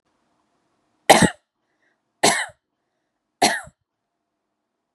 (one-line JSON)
{"three_cough_length": "4.9 s", "three_cough_amplitude": 32768, "three_cough_signal_mean_std_ratio": 0.24, "survey_phase": "beta (2021-08-13 to 2022-03-07)", "age": "18-44", "gender": "Female", "wearing_mask": "No", "symptom_none": true, "smoker_status": "Prefer not to say", "respiratory_condition_asthma": false, "respiratory_condition_other": false, "recruitment_source": "REACT", "submission_delay": "1 day", "covid_test_result": "Negative", "covid_test_method": "RT-qPCR"}